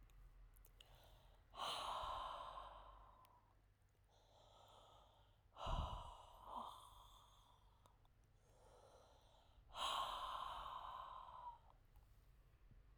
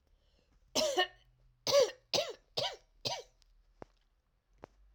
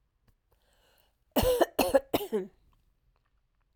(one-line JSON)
{"exhalation_length": "13.0 s", "exhalation_amplitude": 938, "exhalation_signal_mean_std_ratio": 0.57, "three_cough_length": "4.9 s", "three_cough_amplitude": 5320, "three_cough_signal_mean_std_ratio": 0.36, "cough_length": "3.8 s", "cough_amplitude": 11382, "cough_signal_mean_std_ratio": 0.34, "survey_phase": "beta (2021-08-13 to 2022-03-07)", "age": "45-64", "gender": "Female", "wearing_mask": "No", "symptom_cough_any": true, "symptom_runny_or_blocked_nose": true, "symptom_fatigue": true, "symptom_headache": true, "symptom_other": true, "symptom_onset": "4 days", "smoker_status": "Never smoked", "respiratory_condition_asthma": true, "respiratory_condition_other": false, "recruitment_source": "Test and Trace", "submission_delay": "2 days", "covid_test_result": "Positive", "covid_test_method": "RT-qPCR", "covid_ct_value": 12.1, "covid_ct_gene": "ORF1ab gene", "covid_ct_mean": 13.7, "covid_viral_load": "33000000 copies/ml", "covid_viral_load_category": "High viral load (>1M copies/ml)"}